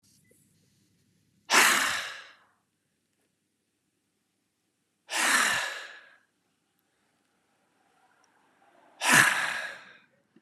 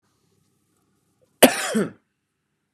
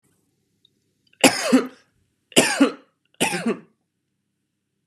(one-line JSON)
{"exhalation_length": "10.4 s", "exhalation_amplitude": 17798, "exhalation_signal_mean_std_ratio": 0.32, "cough_length": "2.7 s", "cough_amplitude": 32768, "cough_signal_mean_std_ratio": 0.23, "three_cough_length": "4.9 s", "three_cough_amplitude": 32749, "three_cough_signal_mean_std_ratio": 0.32, "survey_phase": "beta (2021-08-13 to 2022-03-07)", "age": "18-44", "gender": "Male", "wearing_mask": "No", "symptom_cough_any": true, "symptom_runny_or_blocked_nose": true, "symptom_shortness_of_breath": true, "symptom_onset": "27 days", "smoker_status": "Never smoked", "respiratory_condition_asthma": false, "respiratory_condition_other": false, "recruitment_source": "Test and Trace", "submission_delay": "3 days", "covid_test_result": "Positive", "covid_test_method": "RT-qPCR", "covid_ct_value": 19.6, "covid_ct_gene": "ORF1ab gene", "covid_ct_mean": 20.1, "covid_viral_load": "260000 copies/ml", "covid_viral_load_category": "Low viral load (10K-1M copies/ml)"}